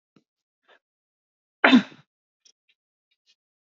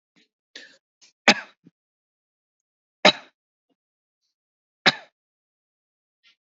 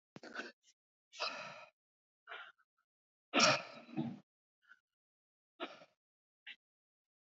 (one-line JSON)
{"cough_length": "3.8 s", "cough_amplitude": 30457, "cough_signal_mean_std_ratio": 0.17, "three_cough_length": "6.5 s", "three_cough_amplitude": 30322, "three_cough_signal_mean_std_ratio": 0.14, "exhalation_length": "7.3 s", "exhalation_amplitude": 5477, "exhalation_signal_mean_std_ratio": 0.26, "survey_phase": "beta (2021-08-13 to 2022-03-07)", "age": "18-44", "gender": "Male", "wearing_mask": "No", "symptom_runny_or_blocked_nose": true, "symptom_sore_throat": true, "symptom_onset": "4 days", "smoker_status": "Never smoked", "respiratory_condition_asthma": false, "respiratory_condition_other": false, "recruitment_source": "REACT", "submission_delay": "2 days", "covid_test_result": "Negative", "covid_test_method": "RT-qPCR", "influenza_a_test_result": "Negative", "influenza_b_test_result": "Negative"}